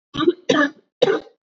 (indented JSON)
{
  "three_cough_length": "1.5 s",
  "three_cough_amplitude": 27527,
  "three_cough_signal_mean_std_ratio": 0.5,
  "survey_phase": "beta (2021-08-13 to 2022-03-07)",
  "age": "45-64",
  "gender": "Female",
  "wearing_mask": "No",
  "symptom_cough_any": true,
  "symptom_runny_or_blocked_nose": true,
  "symptom_shortness_of_breath": true,
  "symptom_fatigue": true,
  "symptom_headache": true,
  "symptom_change_to_sense_of_smell_or_taste": true,
  "symptom_onset": "3 days",
  "smoker_status": "Never smoked",
  "respiratory_condition_asthma": true,
  "respiratory_condition_other": false,
  "recruitment_source": "Test and Trace",
  "submission_delay": "1 day",
  "covid_test_result": "Positive",
  "covid_test_method": "RT-qPCR",
  "covid_ct_value": 18.1,
  "covid_ct_gene": "ORF1ab gene",
  "covid_ct_mean": 18.2,
  "covid_viral_load": "1000000 copies/ml",
  "covid_viral_load_category": "High viral load (>1M copies/ml)"
}